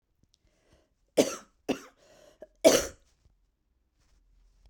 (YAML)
cough_length: 4.7 s
cough_amplitude: 16985
cough_signal_mean_std_ratio: 0.22
survey_phase: beta (2021-08-13 to 2022-03-07)
age: 45-64
gender: Female
wearing_mask: 'No'
symptom_cough_any: true
symptom_runny_or_blocked_nose: true
symptom_sore_throat: true
symptom_fatigue: true
symptom_headache: true
symptom_onset: 2 days
smoker_status: Never smoked
respiratory_condition_asthma: false
respiratory_condition_other: false
recruitment_source: Test and Trace
submission_delay: 1 day
covid_test_result: Positive
covid_test_method: RT-qPCR
covid_ct_value: 19.3
covid_ct_gene: ORF1ab gene
covid_ct_mean: 19.5
covid_viral_load: 390000 copies/ml
covid_viral_load_category: Low viral load (10K-1M copies/ml)